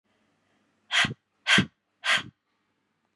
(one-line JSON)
{"exhalation_length": "3.2 s", "exhalation_amplitude": 14076, "exhalation_signal_mean_std_ratio": 0.32, "survey_phase": "beta (2021-08-13 to 2022-03-07)", "age": "45-64", "gender": "Female", "wearing_mask": "No", "symptom_none": true, "smoker_status": "Never smoked", "respiratory_condition_asthma": false, "respiratory_condition_other": false, "recruitment_source": "REACT", "submission_delay": "2 days", "covid_test_result": "Negative", "covid_test_method": "RT-qPCR", "influenza_a_test_result": "Negative", "influenza_b_test_result": "Negative"}